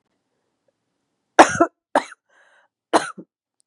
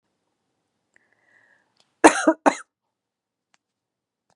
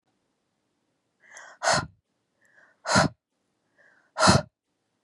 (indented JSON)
{
  "three_cough_length": "3.7 s",
  "three_cough_amplitude": 32768,
  "three_cough_signal_mean_std_ratio": 0.21,
  "cough_length": "4.4 s",
  "cough_amplitude": 32768,
  "cough_signal_mean_std_ratio": 0.17,
  "exhalation_length": "5.0 s",
  "exhalation_amplitude": 20028,
  "exhalation_signal_mean_std_ratio": 0.28,
  "survey_phase": "beta (2021-08-13 to 2022-03-07)",
  "age": "18-44",
  "gender": "Female",
  "wearing_mask": "No",
  "symptom_fatigue": true,
  "symptom_onset": "12 days",
  "smoker_status": "Ex-smoker",
  "respiratory_condition_asthma": false,
  "respiratory_condition_other": false,
  "recruitment_source": "REACT",
  "submission_delay": "1 day",
  "covid_test_result": "Negative",
  "covid_test_method": "RT-qPCR",
  "influenza_a_test_result": "Negative",
  "influenza_b_test_result": "Negative"
}